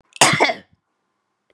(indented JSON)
{
  "cough_length": "1.5 s",
  "cough_amplitude": 32768,
  "cough_signal_mean_std_ratio": 0.35,
  "survey_phase": "beta (2021-08-13 to 2022-03-07)",
  "age": "45-64",
  "gender": "Female",
  "wearing_mask": "No",
  "symptom_none": true,
  "smoker_status": "Ex-smoker",
  "respiratory_condition_asthma": false,
  "respiratory_condition_other": false,
  "recruitment_source": "Test and Trace",
  "submission_delay": "3 days",
  "covid_test_result": "Negative",
  "covid_test_method": "RT-qPCR"
}